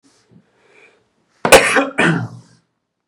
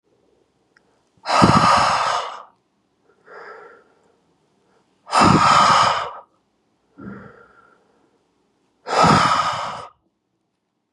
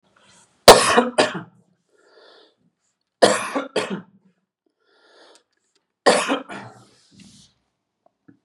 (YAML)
cough_length: 3.1 s
cough_amplitude: 32768
cough_signal_mean_std_ratio: 0.35
exhalation_length: 10.9 s
exhalation_amplitude: 32618
exhalation_signal_mean_std_ratio: 0.42
three_cough_length: 8.4 s
three_cough_amplitude: 32768
three_cough_signal_mean_std_ratio: 0.26
survey_phase: beta (2021-08-13 to 2022-03-07)
age: 18-44
gender: Male
wearing_mask: 'No'
symptom_fatigue: true
smoker_status: Never smoked
respiratory_condition_asthma: true
respiratory_condition_other: false
recruitment_source: REACT
submission_delay: 1 day
covid_test_result: Negative
covid_test_method: RT-qPCR
influenza_a_test_result: Negative
influenza_b_test_result: Negative